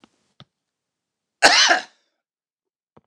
{"cough_length": "3.1 s", "cough_amplitude": 29204, "cough_signal_mean_std_ratio": 0.27, "survey_phase": "beta (2021-08-13 to 2022-03-07)", "age": "65+", "gender": "Male", "wearing_mask": "No", "symptom_none": true, "smoker_status": "Ex-smoker", "respiratory_condition_asthma": false, "respiratory_condition_other": false, "recruitment_source": "REACT", "submission_delay": "4 days", "covid_test_result": "Negative", "covid_test_method": "RT-qPCR", "influenza_a_test_result": "Negative", "influenza_b_test_result": "Negative"}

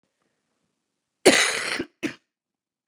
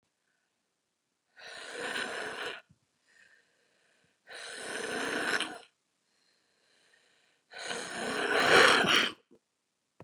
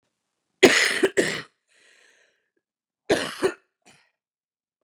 {"cough_length": "2.9 s", "cough_amplitude": 31550, "cough_signal_mean_std_ratio": 0.29, "exhalation_length": "10.0 s", "exhalation_amplitude": 11878, "exhalation_signal_mean_std_ratio": 0.37, "three_cough_length": "4.8 s", "three_cough_amplitude": 32676, "three_cough_signal_mean_std_ratio": 0.3, "survey_phase": "beta (2021-08-13 to 2022-03-07)", "age": "45-64", "gender": "Female", "wearing_mask": "No", "symptom_cough_any": true, "symptom_new_continuous_cough": true, "symptom_runny_or_blocked_nose": true, "symptom_sore_throat": true, "symptom_fatigue": true, "symptom_fever_high_temperature": true, "symptom_headache": true, "symptom_onset": "5 days", "smoker_status": "Current smoker (1 to 10 cigarettes per day)", "respiratory_condition_asthma": false, "respiratory_condition_other": false, "recruitment_source": "Test and Trace", "submission_delay": "1 day", "covid_test_result": "Negative", "covid_test_method": "RT-qPCR"}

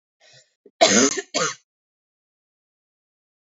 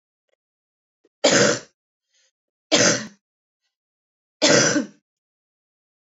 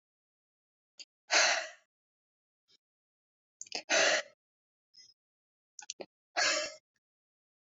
{"cough_length": "3.5 s", "cough_amplitude": 26903, "cough_signal_mean_std_ratio": 0.29, "three_cough_length": "6.1 s", "three_cough_amplitude": 27169, "three_cough_signal_mean_std_ratio": 0.33, "exhalation_length": "7.7 s", "exhalation_amplitude": 8245, "exhalation_signal_mean_std_ratio": 0.29, "survey_phase": "alpha (2021-03-01 to 2021-08-12)", "age": "18-44", "gender": "Female", "wearing_mask": "No", "symptom_none": true, "smoker_status": "Current smoker (1 to 10 cigarettes per day)", "respiratory_condition_asthma": false, "respiratory_condition_other": false, "recruitment_source": "REACT", "submission_delay": "1 day", "covid_test_result": "Negative", "covid_test_method": "RT-qPCR"}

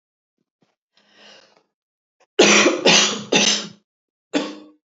{"cough_length": "4.9 s", "cough_amplitude": 29409, "cough_signal_mean_std_ratio": 0.39, "survey_phase": "alpha (2021-03-01 to 2021-08-12)", "age": "45-64", "gender": "Female", "wearing_mask": "No", "symptom_none": true, "symptom_onset": "6 days", "smoker_status": "Ex-smoker", "respiratory_condition_asthma": false, "respiratory_condition_other": false, "recruitment_source": "REACT", "submission_delay": "1 day", "covid_test_result": "Negative", "covid_test_method": "RT-qPCR"}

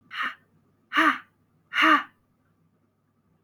{"exhalation_length": "3.4 s", "exhalation_amplitude": 14596, "exhalation_signal_mean_std_ratio": 0.34, "survey_phase": "alpha (2021-03-01 to 2021-08-12)", "age": "18-44", "gender": "Female", "wearing_mask": "No", "symptom_headache": true, "smoker_status": "Never smoked", "respiratory_condition_asthma": false, "respiratory_condition_other": false, "recruitment_source": "Test and Trace", "submission_delay": "1 day", "covid_test_result": "Positive", "covid_test_method": "RT-qPCR", "covid_ct_value": 18.5, "covid_ct_gene": "ORF1ab gene", "covid_ct_mean": 19.3, "covid_viral_load": "460000 copies/ml", "covid_viral_load_category": "Low viral load (10K-1M copies/ml)"}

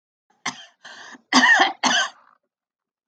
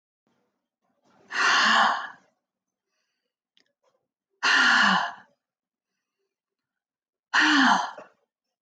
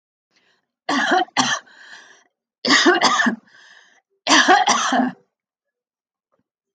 {"cough_length": "3.1 s", "cough_amplitude": 26485, "cough_signal_mean_std_ratio": 0.39, "exhalation_length": "8.6 s", "exhalation_amplitude": 13867, "exhalation_signal_mean_std_ratio": 0.4, "three_cough_length": "6.7 s", "three_cough_amplitude": 28389, "three_cough_signal_mean_std_ratio": 0.46, "survey_phase": "alpha (2021-03-01 to 2021-08-12)", "age": "45-64", "gender": "Female", "wearing_mask": "No", "symptom_none": true, "smoker_status": "Never smoked", "respiratory_condition_asthma": false, "respiratory_condition_other": false, "recruitment_source": "REACT", "submission_delay": "1 day", "covid_test_result": "Negative", "covid_test_method": "RT-qPCR"}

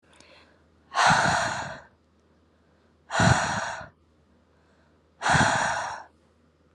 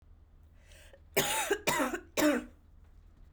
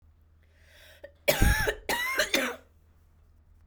{"exhalation_length": "6.7 s", "exhalation_amplitude": 15345, "exhalation_signal_mean_std_ratio": 0.45, "cough_length": "3.3 s", "cough_amplitude": 6724, "cough_signal_mean_std_ratio": 0.49, "three_cough_length": "3.7 s", "three_cough_amplitude": 13576, "three_cough_signal_mean_std_ratio": 0.44, "survey_phase": "alpha (2021-03-01 to 2021-08-12)", "age": "18-44", "gender": "Female", "wearing_mask": "No", "symptom_cough_any": true, "symptom_fever_high_temperature": true, "symptom_headache": true, "smoker_status": "Current smoker (11 or more cigarettes per day)", "respiratory_condition_asthma": false, "respiratory_condition_other": false, "recruitment_source": "Test and Trace", "submission_delay": "1 day", "covid_test_result": "Positive", "covid_test_method": "RT-qPCR", "covid_ct_value": 26.4, "covid_ct_gene": "ORF1ab gene"}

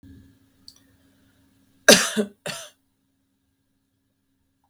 {"cough_length": "4.7 s", "cough_amplitude": 32768, "cough_signal_mean_std_ratio": 0.19, "survey_phase": "beta (2021-08-13 to 2022-03-07)", "age": "45-64", "gender": "Female", "wearing_mask": "No", "symptom_runny_or_blocked_nose": true, "symptom_sore_throat": true, "symptom_headache": true, "smoker_status": "Ex-smoker", "respiratory_condition_asthma": false, "respiratory_condition_other": false, "recruitment_source": "Test and Trace", "submission_delay": "1 day", "covid_test_result": "Negative", "covid_test_method": "ePCR"}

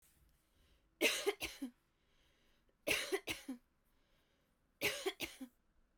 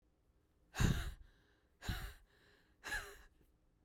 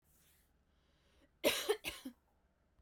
{"three_cough_length": "6.0 s", "three_cough_amplitude": 3592, "three_cough_signal_mean_std_ratio": 0.37, "exhalation_length": "3.8 s", "exhalation_amplitude": 3341, "exhalation_signal_mean_std_ratio": 0.36, "cough_length": "2.8 s", "cough_amplitude": 3507, "cough_signal_mean_std_ratio": 0.3, "survey_phase": "beta (2021-08-13 to 2022-03-07)", "age": "18-44", "gender": "Female", "wearing_mask": "No", "symptom_none": true, "smoker_status": "Never smoked", "respiratory_condition_asthma": false, "respiratory_condition_other": false, "recruitment_source": "REACT", "submission_delay": "1 day", "covid_test_result": "Negative", "covid_test_method": "RT-qPCR"}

